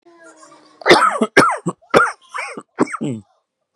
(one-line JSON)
{"cough_length": "3.8 s", "cough_amplitude": 32768, "cough_signal_mean_std_ratio": 0.43, "survey_phase": "beta (2021-08-13 to 2022-03-07)", "age": "45-64", "gender": "Male", "wearing_mask": "No", "symptom_cough_any": true, "symptom_runny_or_blocked_nose": true, "symptom_fatigue": true, "symptom_onset": "12 days", "smoker_status": "Ex-smoker", "respiratory_condition_asthma": false, "respiratory_condition_other": false, "recruitment_source": "REACT", "submission_delay": "8 days", "covid_test_result": "Negative", "covid_test_method": "RT-qPCR", "influenza_a_test_result": "Negative", "influenza_b_test_result": "Negative"}